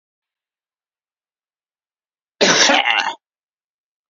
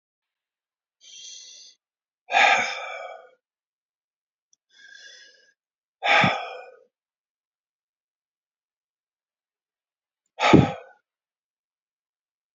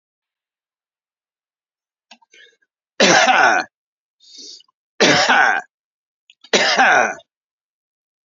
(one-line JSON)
{"cough_length": "4.1 s", "cough_amplitude": 30647, "cough_signal_mean_std_ratio": 0.32, "exhalation_length": "12.5 s", "exhalation_amplitude": 27466, "exhalation_signal_mean_std_ratio": 0.24, "three_cough_length": "8.3 s", "three_cough_amplitude": 31310, "three_cough_signal_mean_std_ratio": 0.38, "survey_phase": "beta (2021-08-13 to 2022-03-07)", "age": "65+", "gender": "Male", "wearing_mask": "No", "symptom_none": true, "smoker_status": "Never smoked", "respiratory_condition_asthma": false, "respiratory_condition_other": false, "recruitment_source": "REACT", "submission_delay": "1 day", "covid_test_result": "Negative", "covid_test_method": "RT-qPCR", "influenza_a_test_result": "Negative", "influenza_b_test_result": "Negative"}